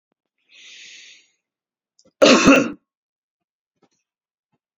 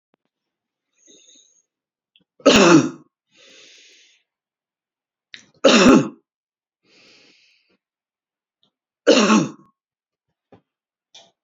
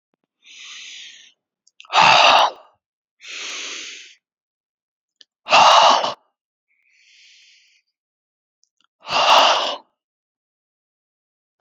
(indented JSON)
{
  "cough_length": "4.8 s",
  "cough_amplitude": 29798,
  "cough_signal_mean_std_ratio": 0.25,
  "three_cough_length": "11.4 s",
  "three_cough_amplitude": 32767,
  "three_cough_signal_mean_std_ratio": 0.27,
  "exhalation_length": "11.6 s",
  "exhalation_amplitude": 31273,
  "exhalation_signal_mean_std_ratio": 0.34,
  "survey_phase": "beta (2021-08-13 to 2022-03-07)",
  "age": "65+",
  "gender": "Male",
  "wearing_mask": "No",
  "symptom_none": true,
  "smoker_status": "Never smoked",
  "respiratory_condition_asthma": false,
  "respiratory_condition_other": false,
  "recruitment_source": "REACT",
  "submission_delay": "1 day",
  "covid_test_result": "Negative",
  "covid_test_method": "RT-qPCR",
  "influenza_a_test_result": "Negative",
  "influenza_b_test_result": "Negative"
}